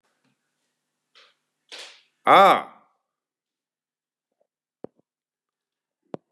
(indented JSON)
{
  "exhalation_length": "6.3 s",
  "exhalation_amplitude": 27729,
  "exhalation_signal_mean_std_ratio": 0.19,
  "survey_phase": "beta (2021-08-13 to 2022-03-07)",
  "age": "45-64",
  "gender": "Male",
  "wearing_mask": "No",
  "symptom_runny_or_blocked_nose": true,
  "symptom_fatigue": true,
  "smoker_status": "Current smoker (1 to 10 cigarettes per day)",
  "respiratory_condition_asthma": false,
  "respiratory_condition_other": false,
  "recruitment_source": "REACT",
  "submission_delay": "4 days",
  "covid_test_result": "Positive",
  "covid_test_method": "RT-qPCR",
  "covid_ct_value": 35.5,
  "covid_ct_gene": "N gene",
  "influenza_a_test_result": "Negative",
  "influenza_b_test_result": "Negative"
}